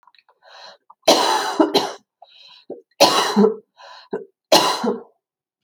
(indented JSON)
{
  "three_cough_length": "5.6 s",
  "three_cough_amplitude": 32528,
  "three_cough_signal_mean_std_ratio": 0.44,
  "survey_phase": "alpha (2021-03-01 to 2021-08-12)",
  "age": "45-64",
  "gender": "Female",
  "wearing_mask": "No",
  "symptom_cough_any": true,
  "symptom_shortness_of_breath": true,
  "smoker_status": "Ex-smoker",
  "respiratory_condition_asthma": true,
  "respiratory_condition_other": false,
  "recruitment_source": "REACT",
  "submission_delay": "8 days",
  "covid_test_result": "Negative",
  "covid_test_method": "RT-qPCR"
}